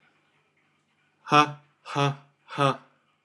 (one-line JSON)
{"exhalation_length": "3.2 s", "exhalation_amplitude": 24209, "exhalation_signal_mean_std_ratio": 0.3, "survey_phase": "beta (2021-08-13 to 2022-03-07)", "age": "45-64", "gender": "Male", "wearing_mask": "No", "symptom_cough_any": true, "symptom_runny_or_blocked_nose": true, "symptom_sore_throat": true, "symptom_fatigue": true, "symptom_headache": true, "symptom_change_to_sense_of_smell_or_taste": true, "symptom_onset": "2 days", "smoker_status": "Never smoked", "respiratory_condition_asthma": false, "respiratory_condition_other": false, "recruitment_source": "Test and Trace", "submission_delay": "1 day", "covid_test_result": "Positive", "covid_test_method": "RT-qPCR", "covid_ct_value": 19.9, "covid_ct_gene": "ORF1ab gene", "covid_ct_mean": 20.8, "covid_viral_load": "150000 copies/ml", "covid_viral_load_category": "Low viral load (10K-1M copies/ml)"}